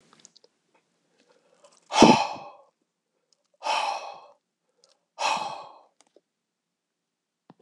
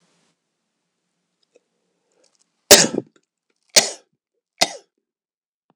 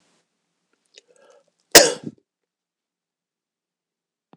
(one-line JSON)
{"exhalation_length": "7.6 s", "exhalation_amplitude": 26028, "exhalation_signal_mean_std_ratio": 0.25, "three_cough_length": "5.8 s", "three_cough_amplitude": 26028, "three_cough_signal_mean_std_ratio": 0.18, "cough_length": "4.4 s", "cough_amplitude": 26028, "cough_signal_mean_std_ratio": 0.15, "survey_phase": "beta (2021-08-13 to 2022-03-07)", "age": "45-64", "gender": "Male", "wearing_mask": "No", "symptom_cough_any": true, "symptom_change_to_sense_of_smell_or_taste": true, "symptom_onset": "6 days", "smoker_status": "Never smoked", "respiratory_condition_asthma": false, "respiratory_condition_other": false, "recruitment_source": "Test and Trace", "submission_delay": "2 days", "covid_test_result": "Positive", "covid_test_method": "RT-qPCR", "covid_ct_value": 20.3, "covid_ct_gene": "ORF1ab gene", "covid_ct_mean": 21.1, "covid_viral_load": "120000 copies/ml", "covid_viral_load_category": "Low viral load (10K-1M copies/ml)"}